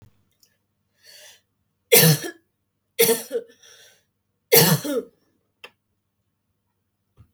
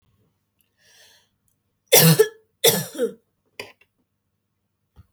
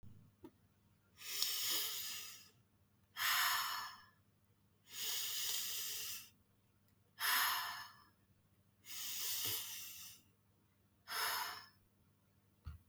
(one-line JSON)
{"three_cough_length": "7.3 s", "three_cough_amplitude": 32766, "three_cough_signal_mean_std_ratio": 0.28, "cough_length": "5.1 s", "cough_amplitude": 32766, "cough_signal_mean_std_ratio": 0.27, "exhalation_length": "12.9 s", "exhalation_amplitude": 4222, "exhalation_signal_mean_std_ratio": 0.56, "survey_phase": "beta (2021-08-13 to 2022-03-07)", "age": "18-44", "gender": "Female", "wearing_mask": "No", "symptom_none": true, "smoker_status": "Never smoked", "respiratory_condition_asthma": false, "respiratory_condition_other": false, "recruitment_source": "REACT", "submission_delay": "3 days", "covid_test_result": "Negative", "covid_test_method": "RT-qPCR", "influenza_a_test_result": "Negative", "influenza_b_test_result": "Negative"}